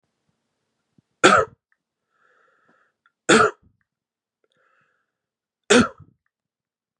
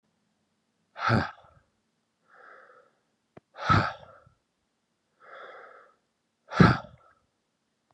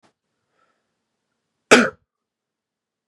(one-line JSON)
{"three_cough_length": "7.0 s", "three_cough_amplitude": 32768, "three_cough_signal_mean_std_ratio": 0.23, "exhalation_length": "7.9 s", "exhalation_amplitude": 19697, "exhalation_signal_mean_std_ratio": 0.24, "cough_length": "3.1 s", "cough_amplitude": 32768, "cough_signal_mean_std_ratio": 0.17, "survey_phase": "beta (2021-08-13 to 2022-03-07)", "age": "18-44", "gender": "Male", "wearing_mask": "No", "symptom_none": true, "smoker_status": "Never smoked", "respiratory_condition_asthma": true, "respiratory_condition_other": false, "recruitment_source": "REACT", "submission_delay": "1 day", "covid_test_result": "Negative", "covid_test_method": "RT-qPCR", "influenza_a_test_result": "Negative", "influenza_b_test_result": "Negative"}